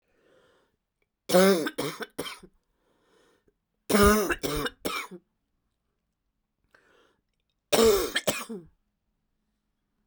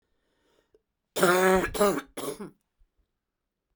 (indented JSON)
{
  "three_cough_length": "10.1 s",
  "three_cough_amplitude": 16387,
  "three_cough_signal_mean_std_ratio": 0.34,
  "cough_length": "3.8 s",
  "cough_amplitude": 13446,
  "cough_signal_mean_std_ratio": 0.39,
  "survey_phase": "beta (2021-08-13 to 2022-03-07)",
  "age": "45-64",
  "gender": "Female",
  "wearing_mask": "No",
  "symptom_cough_any": true,
  "symptom_new_continuous_cough": true,
  "symptom_runny_or_blocked_nose": true,
  "symptom_shortness_of_breath": true,
  "symptom_fatigue": true,
  "symptom_headache": true,
  "symptom_change_to_sense_of_smell_or_taste": true,
  "symptom_loss_of_taste": true,
  "symptom_onset": "5 days",
  "smoker_status": "Ex-smoker",
  "respiratory_condition_asthma": true,
  "respiratory_condition_other": false,
  "recruitment_source": "REACT",
  "submission_delay": "1 day",
  "covid_test_result": "Positive",
  "covid_test_method": "RT-qPCR",
  "covid_ct_value": 25.0,
  "covid_ct_gene": "E gene"
}